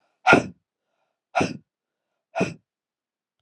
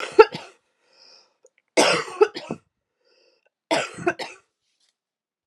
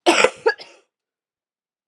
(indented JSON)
{
  "exhalation_length": "3.4 s",
  "exhalation_amplitude": 28425,
  "exhalation_signal_mean_std_ratio": 0.26,
  "three_cough_length": "5.5 s",
  "three_cough_amplitude": 32675,
  "three_cough_signal_mean_std_ratio": 0.26,
  "cough_length": "1.9 s",
  "cough_amplitude": 32767,
  "cough_signal_mean_std_ratio": 0.31,
  "survey_phase": "alpha (2021-03-01 to 2021-08-12)",
  "age": "45-64",
  "gender": "Female",
  "wearing_mask": "No",
  "symptom_cough_any": true,
  "symptom_shortness_of_breath": true,
  "smoker_status": "Never smoked",
  "respiratory_condition_asthma": false,
  "respiratory_condition_other": false,
  "recruitment_source": "Test and Trace",
  "submission_delay": "2 days",
  "covid_test_result": "Positive",
  "covid_test_method": "RT-qPCR",
  "covid_ct_value": 15.4,
  "covid_ct_gene": "ORF1ab gene",
  "covid_ct_mean": 15.4,
  "covid_viral_load": "9100000 copies/ml",
  "covid_viral_load_category": "High viral load (>1M copies/ml)"
}